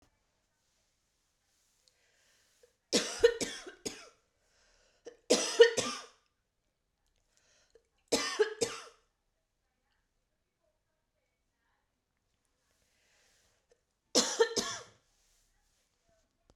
{"cough_length": "16.6 s", "cough_amplitude": 12430, "cough_signal_mean_std_ratio": 0.23, "survey_phase": "beta (2021-08-13 to 2022-03-07)", "age": "18-44", "gender": "Female", "wearing_mask": "No", "symptom_runny_or_blocked_nose": true, "symptom_headache": true, "symptom_change_to_sense_of_smell_or_taste": true, "symptom_loss_of_taste": true, "symptom_onset": "2 days", "smoker_status": "Never smoked", "respiratory_condition_asthma": false, "respiratory_condition_other": false, "recruitment_source": "Test and Trace", "submission_delay": "2 days", "covid_test_result": "Positive", "covid_test_method": "RT-qPCR", "covid_ct_value": 22.4, "covid_ct_gene": "ORF1ab gene"}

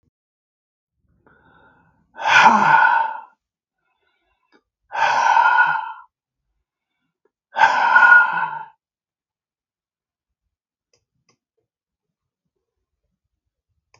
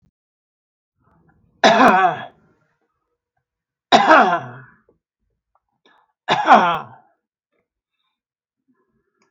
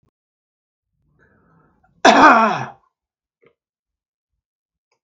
{"exhalation_length": "14.0 s", "exhalation_amplitude": 32768, "exhalation_signal_mean_std_ratio": 0.35, "three_cough_length": "9.3 s", "three_cough_amplitude": 32768, "three_cough_signal_mean_std_ratio": 0.31, "cough_length": "5.0 s", "cough_amplitude": 32768, "cough_signal_mean_std_ratio": 0.26, "survey_phase": "beta (2021-08-13 to 2022-03-07)", "age": "65+", "gender": "Male", "wearing_mask": "No", "symptom_none": true, "smoker_status": "Ex-smoker", "respiratory_condition_asthma": false, "respiratory_condition_other": false, "recruitment_source": "REACT", "submission_delay": "2 days", "covid_test_result": "Negative", "covid_test_method": "RT-qPCR", "influenza_a_test_result": "Negative", "influenza_b_test_result": "Negative"}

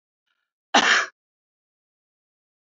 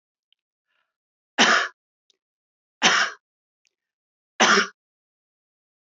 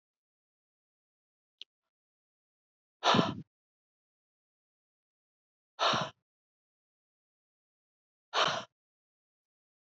{"cough_length": "2.7 s", "cough_amplitude": 26360, "cough_signal_mean_std_ratio": 0.26, "three_cough_length": "5.8 s", "three_cough_amplitude": 25301, "three_cough_signal_mean_std_ratio": 0.29, "exhalation_length": "10.0 s", "exhalation_amplitude": 9557, "exhalation_signal_mean_std_ratio": 0.22, "survey_phase": "beta (2021-08-13 to 2022-03-07)", "age": "65+", "gender": "Female", "wearing_mask": "No", "symptom_none": true, "smoker_status": "Never smoked", "respiratory_condition_asthma": false, "respiratory_condition_other": false, "recruitment_source": "REACT", "submission_delay": "1 day", "covid_test_result": "Negative", "covid_test_method": "RT-qPCR", "influenza_a_test_result": "Unknown/Void", "influenza_b_test_result": "Unknown/Void"}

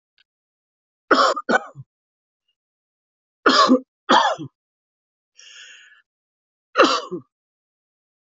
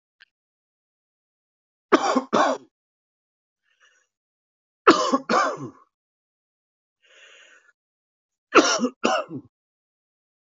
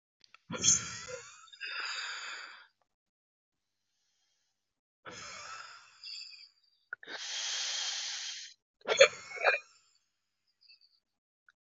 {"cough_length": "8.3 s", "cough_amplitude": 32768, "cough_signal_mean_std_ratio": 0.31, "three_cough_length": "10.5 s", "three_cough_amplitude": 27552, "three_cough_signal_mean_std_ratio": 0.29, "exhalation_length": "11.8 s", "exhalation_amplitude": 16958, "exhalation_signal_mean_std_ratio": 0.33, "survey_phase": "alpha (2021-03-01 to 2021-08-12)", "age": "45-64", "gender": "Male", "wearing_mask": "No", "symptom_cough_any": true, "symptom_new_continuous_cough": true, "symptom_shortness_of_breath": true, "symptom_fatigue": true, "symptom_change_to_sense_of_smell_or_taste": true, "symptom_loss_of_taste": true, "symptom_onset": "5 days", "smoker_status": "Never smoked", "respiratory_condition_asthma": false, "respiratory_condition_other": false, "recruitment_source": "Test and Trace", "submission_delay": "2 days", "covid_test_result": "Positive", "covid_test_method": "RT-qPCR", "covid_ct_value": 14.2, "covid_ct_gene": "ORF1ab gene", "covid_ct_mean": 14.9, "covid_viral_load": "13000000 copies/ml", "covid_viral_load_category": "High viral load (>1M copies/ml)"}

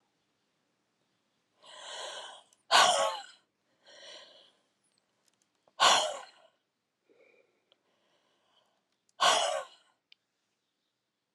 {"exhalation_length": "11.3 s", "exhalation_amplitude": 12821, "exhalation_signal_mean_std_ratio": 0.27, "survey_phase": "alpha (2021-03-01 to 2021-08-12)", "age": "45-64", "gender": "Female", "wearing_mask": "No", "symptom_none": true, "symptom_onset": "12 days", "smoker_status": "Never smoked", "respiratory_condition_asthma": true, "respiratory_condition_other": false, "recruitment_source": "REACT", "submission_delay": "2 days", "covid_test_result": "Negative", "covid_test_method": "RT-qPCR"}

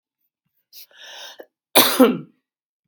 {"cough_length": "2.9 s", "cough_amplitude": 32768, "cough_signal_mean_std_ratio": 0.29, "survey_phase": "beta (2021-08-13 to 2022-03-07)", "age": "65+", "gender": "Female", "wearing_mask": "No", "symptom_cough_any": true, "symptom_runny_or_blocked_nose": true, "smoker_status": "Never smoked", "respiratory_condition_asthma": false, "respiratory_condition_other": false, "recruitment_source": "Test and Trace", "submission_delay": "3 days", "covid_test_result": "Positive", "covid_test_method": "LFT"}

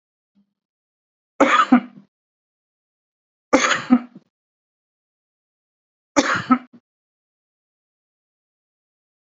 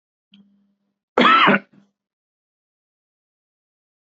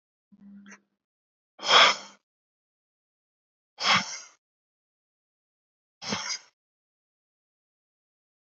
{"three_cough_length": "9.4 s", "three_cough_amplitude": 30026, "three_cough_signal_mean_std_ratio": 0.25, "cough_length": "4.2 s", "cough_amplitude": 28290, "cough_signal_mean_std_ratio": 0.26, "exhalation_length": "8.4 s", "exhalation_amplitude": 21114, "exhalation_signal_mean_std_ratio": 0.22, "survey_phase": "beta (2021-08-13 to 2022-03-07)", "age": "45-64", "gender": "Male", "wearing_mask": "No", "symptom_none": true, "smoker_status": "Current smoker (e-cigarettes or vapes only)", "respiratory_condition_asthma": false, "respiratory_condition_other": false, "recruitment_source": "REACT", "submission_delay": "0 days", "covid_test_result": "Negative", "covid_test_method": "RT-qPCR", "influenza_a_test_result": "Negative", "influenza_b_test_result": "Negative"}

